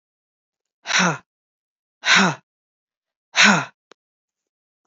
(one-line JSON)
{"exhalation_length": "4.9 s", "exhalation_amplitude": 28870, "exhalation_signal_mean_std_ratio": 0.32, "survey_phase": "beta (2021-08-13 to 2022-03-07)", "age": "45-64", "gender": "Female", "wearing_mask": "No", "symptom_new_continuous_cough": true, "symptom_runny_or_blocked_nose": true, "symptom_sore_throat": true, "symptom_fatigue": true, "symptom_change_to_sense_of_smell_or_taste": true, "symptom_onset": "2 days", "smoker_status": "Never smoked", "respiratory_condition_asthma": false, "respiratory_condition_other": false, "recruitment_source": "Test and Trace", "submission_delay": "1 day", "covid_test_result": "Positive", "covid_test_method": "RT-qPCR", "covid_ct_value": 19.8, "covid_ct_gene": "ORF1ab gene", "covid_ct_mean": 20.4, "covid_viral_load": "210000 copies/ml", "covid_viral_load_category": "Low viral load (10K-1M copies/ml)"}